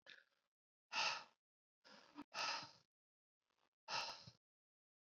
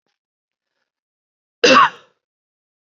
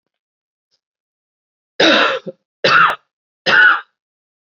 {"exhalation_length": "5.0 s", "exhalation_amplitude": 1153, "exhalation_signal_mean_std_ratio": 0.35, "cough_length": "2.9 s", "cough_amplitude": 29700, "cough_signal_mean_std_ratio": 0.24, "three_cough_length": "4.5 s", "three_cough_amplitude": 30376, "three_cough_signal_mean_std_ratio": 0.4, "survey_phase": "alpha (2021-03-01 to 2021-08-12)", "age": "18-44", "gender": "Male", "wearing_mask": "No", "symptom_cough_any": true, "symptom_fatigue": true, "symptom_change_to_sense_of_smell_or_taste": true, "smoker_status": "Ex-smoker", "respiratory_condition_asthma": false, "respiratory_condition_other": false, "recruitment_source": "Test and Trace", "submission_delay": "2 days", "covid_test_result": "Positive", "covid_test_method": "RT-qPCR", "covid_ct_value": 18.6, "covid_ct_gene": "N gene", "covid_ct_mean": 19.6, "covid_viral_load": "370000 copies/ml", "covid_viral_load_category": "Low viral load (10K-1M copies/ml)"}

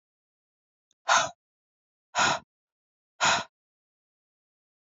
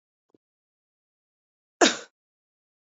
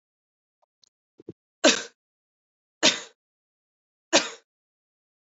{"exhalation_length": "4.9 s", "exhalation_amplitude": 13143, "exhalation_signal_mean_std_ratio": 0.28, "cough_length": "2.9 s", "cough_amplitude": 22360, "cough_signal_mean_std_ratio": 0.16, "three_cough_length": "5.4 s", "three_cough_amplitude": 22966, "three_cough_signal_mean_std_ratio": 0.21, "survey_phase": "alpha (2021-03-01 to 2021-08-12)", "age": "18-44", "gender": "Female", "wearing_mask": "No", "symptom_shortness_of_breath": true, "symptom_fatigue": true, "symptom_headache": true, "symptom_change_to_sense_of_smell_or_taste": true, "symptom_loss_of_taste": true, "symptom_onset": "3 days", "smoker_status": "Never smoked", "respiratory_condition_asthma": false, "respiratory_condition_other": false, "recruitment_source": "Test and Trace", "submission_delay": "2 days", "covid_test_result": "Positive", "covid_test_method": "RT-qPCR", "covid_ct_value": 17.3, "covid_ct_gene": "ORF1ab gene", "covid_ct_mean": 17.9, "covid_viral_load": "1300000 copies/ml", "covid_viral_load_category": "High viral load (>1M copies/ml)"}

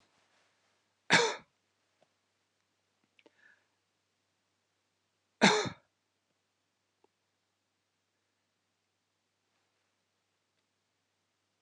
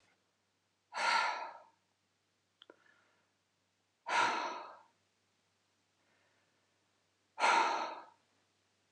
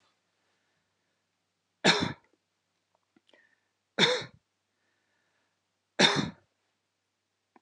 {"cough_length": "11.6 s", "cough_amplitude": 12412, "cough_signal_mean_std_ratio": 0.15, "exhalation_length": "8.9 s", "exhalation_amplitude": 4751, "exhalation_signal_mean_std_ratio": 0.34, "three_cough_length": "7.6 s", "three_cough_amplitude": 15796, "three_cough_signal_mean_std_ratio": 0.23, "survey_phase": "alpha (2021-03-01 to 2021-08-12)", "age": "65+", "gender": "Female", "wearing_mask": "No", "symptom_none": true, "smoker_status": "Ex-smoker", "respiratory_condition_asthma": false, "respiratory_condition_other": false, "recruitment_source": "REACT", "submission_delay": "1 day", "covid_test_result": "Negative", "covid_test_method": "RT-qPCR"}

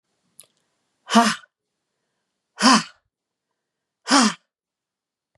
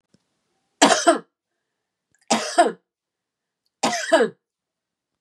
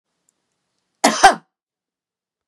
{"exhalation_length": "5.4 s", "exhalation_amplitude": 31516, "exhalation_signal_mean_std_ratio": 0.27, "three_cough_length": "5.2 s", "three_cough_amplitude": 32767, "three_cough_signal_mean_std_ratio": 0.33, "cough_length": "2.5 s", "cough_amplitude": 32768, "cough_signal_mean_std_ratio": 0.23, "survey_phase": "beta (2021-08-13 to 2022-03-07)", "age": "45-64", "gender": "Female", "wearing_mask": "No", "symptom_none": true, "smoker_status": "Ex-smoker", "respiratory_condition_asthma": false, "respiratory_condition_other": false, "recruitment_source": "REACT", "submission_delay": "5 days", "covid_test_result": "Negative", "covid_test_method": "RT-qPCR", "influenza_a_test_result": "Negative", "influenza_b_test_result": "Negative"}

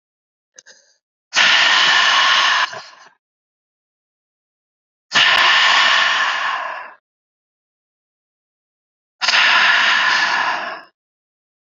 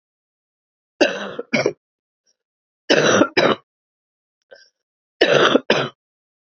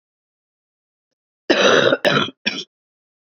{"exhalation_length": "11.7 s", "exhalation_amplitude": 32764, "exhalation_signal_mean_std_ratio": 0.54, "three_cough_length": "6.5 s", "three_cough_amplitude": 29392, "three_cough_signal_mean_std_ratio": 0.37, "cough_length": "3.3 s", "cough_amplitude": 30321, "cough_signal_mean_std_ratio": 0.39, "survey_phase": "beta (2021-08-13 to 2022-03-07)", "age": "18-44", "gender": "Female", "wearing_mask": "No", "symptom_cough_any": true, "symptom_runny_or_blocked_nose": true, "symptom_shortness_of_breath": true, "symptom_abdominal_pain": true, "symptom_fatigue": true, "symptom_headache": true, "symptom_onset": "3 days", "smoker_status": "Never smoked", "respiratory_condition_asthma": true, "respiratory_condition_other": false, "recruitment_source": "Test and Trace", "submission_delay": "1 day", "covid_test_result": "Positive", "covid_test_method": "ePCR"}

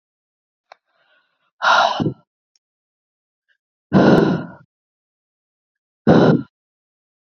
{"exhalation_length": "7.3 s", "exhalation_amplitude": 27415, "exhalation_signal_mean_std_ratio": 0.34, "survey_phase": "alpha (2021-03-01 to 2021-08-12)", "age": "18-44", "gender": "Female", "wearing_mask": "No", "symptom_headache": true, "smoker_status": "Never smoked", "respiratory_condition_asthma": false, "respiratory_condition_other": false, "recruitment_source": "Test and Trace", "submission_delay": "2 days", "covid_test_result": "Positive", "covid_test_method": "RT-qPCR", "covid_ct_value": 26.2, "covid_ct_gene": "N gene"}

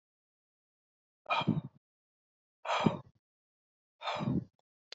{"exhalation_length": "4.9 s", "exhalation_amplitude": 9280, "exhalation_signal_mean_std_ratio": 0.33, "survey_phase": "beta (2021-08-13 to 2022-03-07)", "age": "18-44", "gender": "Female", "wearing_mask": "No", "symptom_none": true, "smoker_status": "Never smoked", "respiratory_condition_asthma": false, "respiratory_condition_other": false, "recruitment_source": "REACT", "submission_delay": "4 days", "covid_test_result": "Negative", "covid_test_method": "RT-qPCR", "influenza_a_test_result": "Negative", "influenza_b_test_result": "Negative"}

